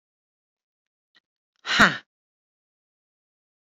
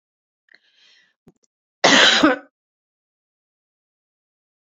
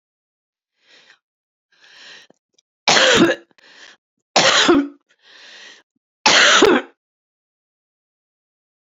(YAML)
exhalation_length: 3.7 s
exhalation_amplitude: 27862
exhalation_signal_mean_std_ratio: 0.17
cough_length: 4.6 s
cough_amplitude: 32767
cough_signal_mean_std_ratio: 0.26
three_cough_length: 8.9 s
three_cough_amplitude: 32768
three_cough_signal_mean_std_ratio: 0.35
survey_phase: beta (2021-08-13 to 2022-03-07)
age: 45-64
gender: Female
wearing_mask: 'No'
symptom_cough_any: true
symptom_runny_or_blocked_nose: true
symptom_fatigue: true
symptom_headache: true
symptom_change_to_sense_of_smell_or_taste: true
symptom_onset: 2 days
smoker_status: Ex-smoker
respiratory_condition_asthma: false
respiratory_condition_other: false
recruitment_source: Test and Trace
submission_delay: 2 days
covid_test_result: Positive
covid_test_method: RT-qPCR
covid_ct_value: 16.6
covid_ct_gene: ORF1ab gene